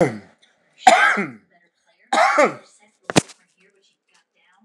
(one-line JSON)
{"three_cough_length": "4.6 s", "three_cough_amplitude": 29204, "three_cough_signal_mean_std_ratio": 0.35, "survey_phase": "alpha (2021-03-01 to 2021-08-12)", "age": "65+", "gender": "Male", "wearing_mask": "No", "symptom_cough_any": true, "symptom_fatigue": true, "smoker_status": "Never smoked", "respiratory_condition_asthma": false, "respiratory_condition_other": false, "recruitment_source": "REACT", "submission_delay": "1 day", "covid_test_result": "Negative", "covid_test_method": "RT-qPCR"}